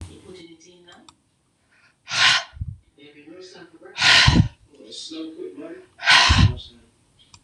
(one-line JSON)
{"exhalation_length": "7.4 s", "exhalation_amplitude": 26028, "exhalation_signal_mean_std_ratio": 0.39, "survey_phase": "beta (2021-08-13 to 2022-03-07)", "age": "65+", "gender": "Female", "wearing_mask": "No", "symptom_fatigue": true, "symptom_onset": "8 days", "smoker_status": "Ex-smoker", "respiratory_condition_asthma": false, "respiratory_condition_other": false, "recruitment_source": "REACT", "submission_delay": "2 days", "covid_test_result": "Negative", "covid_test_method": "RT-qPCR", "influenza_a_test_result": "Unknown/Void", "influenza_b_test_result": "Unknown/Void"}